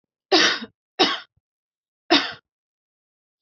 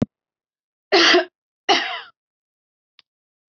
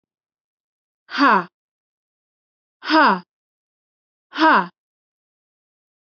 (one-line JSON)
{"three_cough_length": "3.4 s", "three_cough_amplitude": 25357, "three_cough_signal_mean_std_ratio": 0.33, "cough_length": "3.5 s", "cough_amplitude": 23931, "cough_signal_mean_std_ratio": 0.32, "exhalation_length": "6.1 s", "exhalation_amplitude": 23353, "exhalation_signal_mean_std_ratio": 0.29, "survey_phase": "beta (2021-08-13 to 2022-03-07)", "age": "18-44", "gender": "Female", "wearing_mask": "No", "symptom_none": true, "smoker_status": "Ex-smoker", "respiratory_condition_asthma": false, "respiratory_condition_other": false, "recruitment_source": "REACT", "submission_delay": "1 day", "covid_test_result": "Negative", "covid_test_method": "RT-qPCR"}